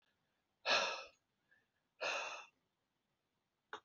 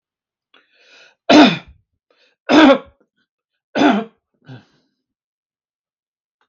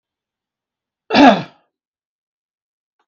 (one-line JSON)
{"exhalation_length": "3.8 s", "exhalation_amplitude": 3240, "exhalation_signal_mean_std_ratio": 0.34, "three_cough_length": "6.5 s", "three_cough_amplitude": 32768, "three_cough_signal_mean_std_ratio": 0.29, "cough_length": "3.1 s", "cough_amplitude": 32768, "cough_signal_mean_std_ratio": 0.23, "survey_phase": "beta (2021-08-13 to 2022-03-07)", "age": "65+", "gender": "Male", "wearing_mask": "No", "symptom_none": true, "smoker_status": "Never smoked", "respiratory_condition_asthma": false, "respiratory_condition_other": false, "recruitment_source": "REACT", "submission_delay": "2 days", "covid_test_result": "Negative", "covid_test_method": "RT-qPCR", "influenza_a_test_result": "Negative", "influenza_b_test_result": "Negative"}